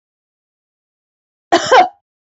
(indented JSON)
{
  "cough_length": "2.4 s",
  "cough_amplitude": 27747,
  "cough_signal_mean_std_ratio": 0.29,
  "survey_phase": "alpha (2021-03-01 to 2021-08-12)",
  "age": "18-44",
  "gender": "Female",
  "wearing_mask": "No",
  "symptom_none": true,
  "smoker_status": "Current smoker (e-cigarettes or vapes only)",
  "respiratory_condition_asthma": false,
  "respiratory_condition_other": false,
  "recruitment_source": "REACT",
  "submission_delay": "1 day",
  "covid_test_result": "Negative",
  "covid_test_method": "RT-qPCR"
}